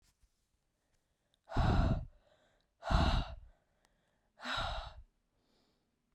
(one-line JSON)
{"exhalation_length": "6.1 s", "exhalation_amplitude": 5570, "exhalation_signal_mean_std_ratio": 0.37, "survey_phase": "beta (2021-08-13 to 2022-03-07)", "age": "18-44", "gender": "Female", "wearing_mask": "No", "symptom_new_continuous_cough": true, "symptom_sore_throat": true, "symptom_fever_high_temperature": true, "smoker_status": "Never smoked", "respiratory_condition_asthma": false, "respiratory_condition_other": false, "recruitment_source": "Test and Trace", "submission_delay": "2 days", "covid_test_result": "Positive", "covid_test_method": "ePCR"}